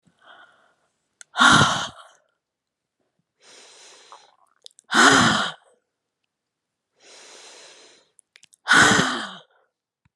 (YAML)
exhalation_length: 10.2 s
exhalation_amplitude: 27614
exhalation_signal_mean_std_ratio: 0.32
survey_phase: beta (2021-08-13 to 2022-03-07)
age: 65+
gender: Female
wearing_mask: 'No'
symptom_none: true
smoker_status: Ex-smoker
respiratory_condition_asthma: false
respiratory_condition_other: false
recruitment_source: REACT
submission_delay: 2 days
covid_test_result: Negative
covid_test_method: RT-qPCR